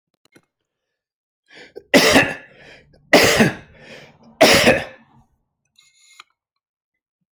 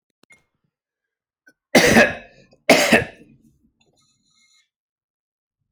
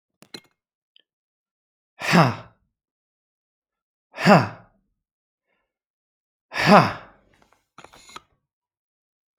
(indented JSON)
{
  "three_cough_length": "7.3 s",
  "three_cough_amplitude": 29810,
  "three_cough_signal_mean_std_ratio": 0.33,
  "cough_length": "5.7 s",
  "cough_amplitude": 29476,
  "cough_signal_mean_std_ratio": 0.28,
  "exhalation_length": "9.4 s",
  "exhalation_amplitude": 29422,
  "exhalation_signal_mean_std_ratio": 0.23,
  "survey_phase": "alpha (2021-03-01 to 2021-08-12)",
  "age": "45-64",
  "gender": "Male",
  "wearing_mask": "No",
  "symptom_none": true,
  "smoker_status": "Never smoked",
  "respiratory_condition_asthma": false,
  "respiratory_condition_other": false,
  "recruitment_source": "REACT",
  "submission_delay": "2 days",
  "covid_test_result": "Negative",
  "covid_test_method": "RT-qPCR"
}